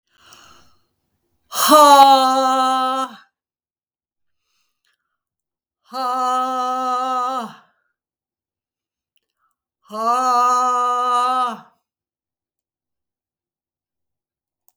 {"exhalation_length": "14.8 s", "exhalation_amplitude": 32768, "exhalation_signal_mean_std_ratio": 0.43, "survey_phase": "beta (2021-08-13 to 2022-03-07)", "age": "65+", "gender": "Female", "wearing_mask": "No", "symptom_none": true, "smoker_status": "Never smoked", "respiratory_condition_asthma": true, "respiratory_condition_other": false, "recruitment_source": "REACT", "submission_delay": "2 days", "covid_test_result": "Negative", "covid_test_method": "RT-qPCR", "influenza_a_test_result": "Negative", "influenza_b_test_result": "Negative"}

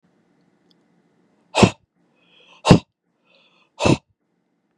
{"exhalation_length": "4.8 s", "exhalation_amplitude": 32768, "exhalation_signal_mean_std_ratio": 0.21, "survey_phase": "beta (2021-08-13 to 2022-03-07)", "age": "45-64", "gender": "Male", "wearing_mask": "No", "symptom_runny_or_blocked_nose": true, "smoker_status": "Never smoked", "respiratory_condition_asthma": false, "respiratory_condition_other": false, "recruitment_source": "REACT", "submission_delay": "0 days", "covid_test_result": "Negative", "covid_test_method": "RT-qPCR", "influenza_a_test_result": "Unknown/Void", "influenza_b_test_result": "Unknown/Void"}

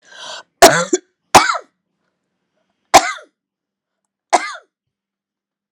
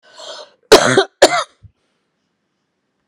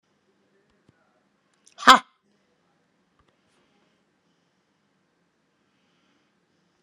{"three_cough_length": "5.7 s", "three_cough_amplitude": 32768, "three_cough_signal_mean_std_ratio": 0.26, "cough_length": "3.1 s", "cough_amplitude": 32768, "cough_signal_mean_std_ratio": 0.31, "exhalation_length": "6.8 s", "exhalation_amplitude": 32768, "exhalation_signal_mean_std_ratio": 0.1, "survey_phase": "alpha (2021-03-01 to 2021-08-12)", "age": "45-64", "gender": "Female", "wearing_mask": "No", "symptom_cough_any": true, "symptom_fatigue": true, "symptom_fever_high_temperature": true, "symptom_headache": true, "symptom_onset": "4 days", "smoker_status": "Ex-smoker", "respiratory_condition_asthma": false, "respiratory_condition_other": false, "recruitment_source": "Test and Trace", "submission_delay": "1 day", "covid_test_result": "Positive", "covid_test_method": "RT-qPCR", "covid_ct_value": 18.5, "covid_ct_gene": "ORF1ab gene", "covid_ct_mean": 19.0, "covid_viral_load": "570000 copies/ml", "covid_viral_load_category": "Low viral load (10K-1M copies/ml)"}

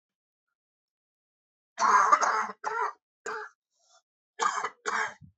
{"cough_length": "5.4 s", "cough_amplitude": 14531, "cough_signal_mean_std_ratio": 0.4, "survey_phase": "beta (2021-08-13 to 2022-03-07)", "age": "45-64", "gender": "Male", "wearing_mask": "No", "symptom_cough_any": true, "symptom_runny_or_blocked_nose": true, "symptom_headache": true, "symptom_loss_of_taste": true, "smoker_status": "Ex-smoker", "respiratory_condition_asthma": false, "respiratory_condition_other": false, "recruitment_source": "Test and Trace", "submission_delay": "2 days", "covid_test_result": "Positive", "covid_test_method": "LFT"}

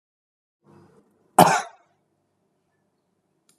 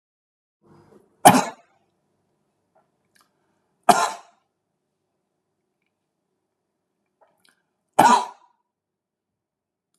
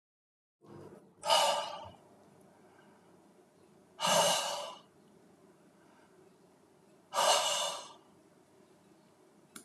{"cough_length": "3.6 s", "cough_amplitude": 32756, "cough_signal_mean_std_ratio": 0.18, "three_cough_length": "10.0 s", "three_cough_amplitude": 32768, "three_cough_signal_mean_std_ratio": 0.19, "exhalation_length": "9.6 s", "exhalation_amplitude": 6850, "exhalation_signal_mean_std_ratio": 0.38, "survey_phase": "alpha (2021-03-01 to 2021-08-12)", "age": "45-64", "gender": "Male", "wearing_mask": "No", "symptom_none": true, "smoker_status": "Never smoked", "respiratory_condition_asthma": false, "respiratory_condition_other": false, "recruitment_source": "REACT", "submission_delay": "2 days", "covid_test_result": "Negative", "covid_test_method": "RT-qPCR"}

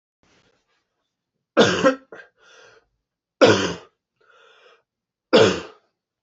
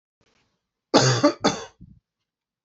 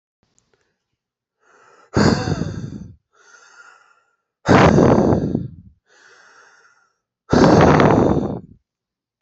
{"three_cough_length": "6.2 s", "three_cough_amplitude": 27881, "three_cough_signal_mean_std_ratio": 0.29, "cough_length": "2.6 s", "cough_amplitude": 25813, "cough_signal_mean_std_ratio": 0.34, "exhalation_length": "9.2 s", "exhalation_amplitude": 31899, "exhalation_signal_mean_std_ratio": 0.42, "survey_phase": "beta (2021-08-13 to 2022-03-07)", "age": "18-44", "gender": "Male", "wearing_mask": "No", "symptom_runny_or_blocked_nose": true, "symptom_shortness_of_breath": true, "symptom_sore_throat": true, "symptom_headache": true, "symptom_onset": "3 days", "smoker_status": "Prefer not to say", "respiratory_condition_asthma": false, "respiratory_condition_other": false, "recruitment_source": "Test and Trace", "submission_delay": "2 days", "covid_test_result": "Positive", "covid_test_method": "RT-qPCR", "covid_ct_value": 15.3, "covid_ct_gene": "ORF1ab gene"}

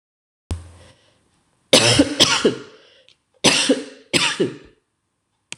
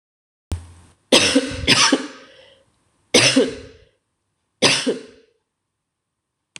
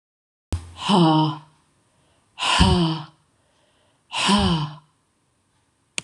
{"cough_length": "5.6 s", "cough_amplitude": 26028, "cough_signal_mean_std_ratio": 0.41, "three_cough_length": "6.6 s", "three_cough_amplitude": 26028, "three_cough_signal_mean_std_ratio": 0.38, "exhalation_length": "6.0 s", "exhalation_amplitude": 24269, "exhalation_signal_mean_std_ratio": 0.45, "survey_phase": "alpha (2021-03-01 to 2021-08-12)", "age": "45-64", "gender": "Female", "wearing_mask": "No", "symptom_cough_any": true, "symptom_fatigue": true, "symptom_fever_high_temperature": true, "symptom_headache": true, "symptom_change_to_sense_of_smell_or_taste": true, "symptom_onset": "4 days", "smoker_status": "Never smoked", "respiratory_condition_asthma": false, "respiratory_condition_other": false, "recruitment_source": "Test and Trace", "submission_delay": "1 day", "covid_test_result": "Positive", "covid_test_method": "RT-qPCR", "covid_ct_value": 29.8, "covid_ct_gene": "ORF1ab gene"}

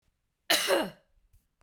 {"cough_length": "1.6 s", "cough_amplitude": 13291, "cough_signal_mean_std_ratio": 0.39, "survey_phase": "beta (2021-08-13 to 2022-03-07)", "age": "45-64", "gender": "Female", "wearing_mask": "Yes", "symptom_runny_or_blocked_nose": true, "symptom_fatigue": true, "symptom_change_to_sense_of_smell_or_taste": true, "smoker_status": "Prefer not to say", "respiratory_condition_asthma": false, "respiratory_condition_other": false, "recruitment_source": "Test and Trace", "submission_delay": "2 days", "covid_test_result": "Positive", "covid_test_method": "LFT"}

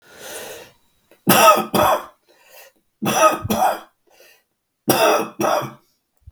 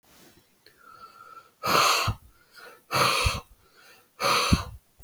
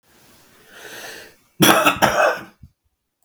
{"three_cough_length": "6.3 s", "three_cough_amplitude": 32768, "three_cough_signal_mean_std_ratio": 0.47, "exhalation_length": "5.0 s", "exhalation_amplitude": 15636, "exhalation_signal_mean_std_ratio": 0.46, "cough_length": "3.2 s", "cough_amplitude": 32768, "cough_signal_mean_std_ratio": 0.4, "survey_phase": "beta (2021-08-13 to 2022-03-07)", "age": "65+", "gender": "Male", "wearing_mask": "No", "symptom_cough_any": true, "symptom_runny_or_blocked_nose": true, "symptom_shortness_of_breath": true, "symptom_diarrhoea": true, "symptom_fatigue": true, "symptom_headache": true, "symptom_onset": "4 days", "smoker_status": "Ex-smoker", "respiratory_condition_asthma": false, "respiratory_condition_other": true, "recruitment_source": "Test and Trace", "submission_delay": "2 days", "covid_test_result": "Positive", "covid_test_method": "RT-qPCR", "covid_ct_value": 25.1, "covid_ct_gene": "ORF1ab gene", "covid_ct_mean": 25.4, "covid_viral_load": "4600 copies/ml", "covid_viral_load_category": "Minimal viral load (< 10K copies/ml)"}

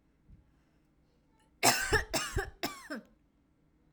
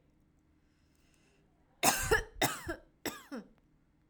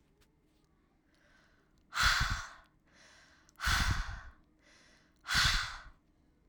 {"cough_length": "3.9 s", "cough_amplitude": 12854, "cough_signal_mean_std_ratio": 0.36, "three_cough_length": "4.1 s", "three_cough_amplitude": 9367, "three_cough_signal_mean_std_ratio": 0.33, "exhalation_length": "6.5 s", "exhalation_amplitude": 5292, "exhalation_signal_mean_std_ratio": 0.4, "survey_phase": "alpha (2021-03-01 to 2021-08-12)", "age": "18-44", "gender": "Female", "wearing_mask": "No", "symptom_none": true, "smoker_status": "Never smoked", "respiratory_condition_asthma": false, "respiratory_condition_other": false, "recruitment_source": "REACT", "submission_delay": "2 days", "covid_test_result": "Negative", "covid_test_method": "RT-qPCR"}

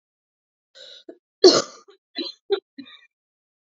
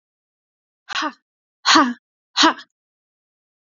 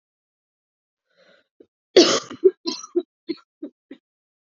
{"three_cough_length": "3.7 s", "three_cough_amplitude": 29686, "three_cough_signal_mean_std_ratio": 0.22, "exhalation_length": "3.8 s", "exhalation_amplitude": 28394, "exhalation_signal_mean_std_ratio": 0.29, "cough_length": "4.4 s", "cough_amplitude": 29839, "cough_signal_mean_std_ratio": 0.24, "survey_phase": "alpha (2021-03-01 to 2021-08-12)", "age": "18-44", "gender": "Female", "wearing_mask": "No", "symptom_cough_any": true, "symptom_fever_high_temperature": true, "symptom_headache": true, "symptom_change_to_sense_of_smell_or_taste": true, "symptom_loss_of_taste": true, "symptom_onset": "4 days", "smoker_status": "Never smoked", "respiratory_condition_asthma": false, "respiratory_condition_other": false, "recruitment_source": "Test and Trace", "submission_delay": "2 days", "covid_test_result": "Positive", "covid_test_method": "RT-qPCR", "covid_ct_value": 13.7, "covid_ct_gene": "ORF1ab gene", "covid_ct_mean": 13.9, "covid_viral_load": "28000000 copies/ml", "covid_viral_load_category": "High viral load (>1M copies/ml)"}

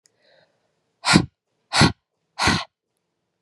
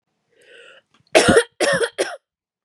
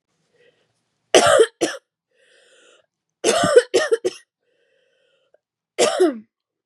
{"exhalation_length": "3.4 s", "exhalation_amplitude": 32767, "exhalation_signal_mean_std_ratio": 0.31, "cough_length": "2.6 s", "cough_amplitude": 32438, "cough_signal_mean_std_ratio": 0.39, "three_cough_length": "6.7 s", "three_cough_amplitude": 32768, "three_cough_signal_mean_std_ratio": 0.35, "survey_phase": "beta (2021-08-13 to 2022-03-07)", "age": "18-44", "gender": "Female", "wearing_mask": "No", "symptom_cough_any": true, "symptom_runny_or_blocked_nose": true, "symptom_headache": true, "symptom_change_to_sense_of_smell_or_taste": true, "symptom_loss_of_taste": true, "smoker_status": "Never smoked", "respiratory_condition_asthma": false, "respiratory_condition_other": false, "recruitment_source": "Test and Trace", "submission_delay": "3 days", "covid_test_result": "Positive", "covid_test_method": "RT-qPCR", "covid_ct_value": 25.4, "covid_ct_gene": "ORF1ab gene"}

